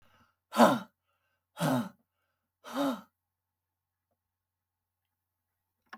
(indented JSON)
{
  "exhalation_length": "6.0 s",
  "exhalation_amplitude": 14424,
  "exhalation_signal_mean_std_ratio": 0.25,
  "survey_phase": "beta (2021-08-13 to 2022-03-07)",
  "age": "65+",
  "gender": "Female",
  "wearing_mask": "No",
  "symptom_none": true,
  "smoker_status": "Never smoked",
  "respiratory_condition_asthma": false,
  "respiratory_condition_other": false,
  "recruitment_source": "REACT",
  "submission_delay": "2 days",
  "covid_test_result": "Negative",
  "covid_test_method": "RT-qPCR",
  "influenza_a_test_result": "Negative",
  "influenza_b_test_result": "Negative"
}